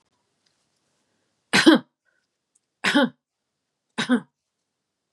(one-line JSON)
{"three_cough_length": "5.1 s", "three_cough_amplitude": 26016, "three_cough_signal_mean_std_ratio": 0.27, "survey_phase": "beta (2021-08-13 to 2022-03-07)", "age": "45-64", "gender": "Female", "wearing_mask": "No", "symptom_none": true, "smoker_status": "Never smoked", "respiratory_condition_asthma": false, "respiratory_condition_other": false, "recruitment_source": "REACT", "submission_delay": "1 day", "covid_test_result": "Negative", "covid_test_method": "RT-qPCR", "influenza_a_test_result": "Negative", "influenza_b_test_result": "Negative"}